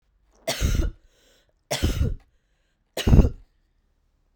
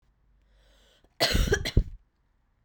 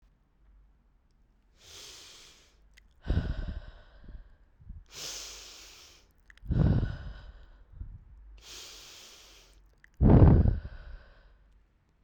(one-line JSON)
{"three_cough_length": "4.4 s", "three_cough_amplitude": 26671, "three_cough_signal_mean_std_ratio": 0.36, "cough_length": "2.6 s", "cough_amplitude": 12101, "cough_signal_mean_std_ratio": 0.35, "exhalation_length": "12.0 s", "exhalation_amplitude": 15313, "exhalation_signal_mean_std_ratio": 0.31, "survey_phase": "beta (2021-08-13 to 2022-03-07)", "age": "18-44", "gender": "Female", "wearing_mask": "No", "symptom_cough_any": true, "symptom_runny_or_blocked_nose": true, "symptom_sore_throat": true, "symptom_fatigue": true, "symptom_headache": true, "smoker_status": "Never smoked", "respiratory_condition_asthma": false, "respiratory_condition_other": false, "recruitment_source": "Test and Trace", "submission_delay": "1 day", "covid_test_result": "Positive", "covid_test_method": "ePCR"}